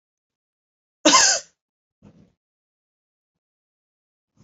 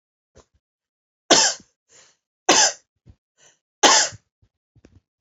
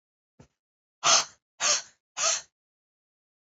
{
  "cough_length": "4.4 s",
  "cough_amplitude": 29841,
  "cough_signal_mean_std_ratio": 0.21,
  "three_cough_length": "5.2 s",
  "three_cough_amplitude": 32768,
  "three_cough_signal_mean_std_ratio": 0.29,
  "exhalation_length": "3.6 s",
  "exhalation_amplitude": 13561,
  "exhalation_signal_mean_std_ratio": 0.32,
  "survey_phase": "beta (2021-08-13 to 2022-03-07)",
  "age": "18-44",
  "gender": "Female",
  "wearing_mask": "No",
  "symptom_cough_any": true,
  "symptom_shortness_of_breath": true,
  "symptom_sore_throat": true,
  "symptom_fatigue": true,
  "symptom_headache": true,
  "symptom_change_to_sense_of_smell_or_taste": true,
  "symptom_other": true,
  "smoker_status": "Ex-smoker",
  "respiratory_condition_asthma": true,
  "respiratory_condition_other": false,
  "recruitment_source": "Test and Trace",
  "submission_delay": "1 day",
  "covid_test_result": "Positive",
  "covid_test_method": "RT-qPCR",
  "covid_ct_value": 30.2,
  "covid_ct_gene": "ORF1ab gene"
}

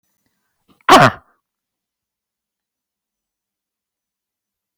{
  "cough_length": "4.8 s",
  "cough_amplitude": 32768,
  "cough_signal_mean_std_ratio": 0.18,
  "survey_phase": "beta (2021-08-13 to 2022-03-07)",
  "age": "18-44",
  "gender": "Female",
  "wearing_mask": "No",
  "symptom_cough_any": true,
  "symptom_sore_throat": true,
  "symptom_headache": true,
  "symptom_change_to_sense_of_smell_or_taste": true,
  "symptom_loss_of_taste": true,
  "symptom_onset": "2 days",
  "smoker_status": "Ex-smoker",
  "respiratory_condition_asthma": false,
  "respiratory_condition_other": false,
  "recruitment_source": "Test and Trace",
  "submission_delay": "2 days",
  "covid_test_result": "Positive",
  "covid_test_method": "RT-qPCR",
  "covid_ct_value": 33.1,
  "covid_ct_gene": "ORF1ab gene"
}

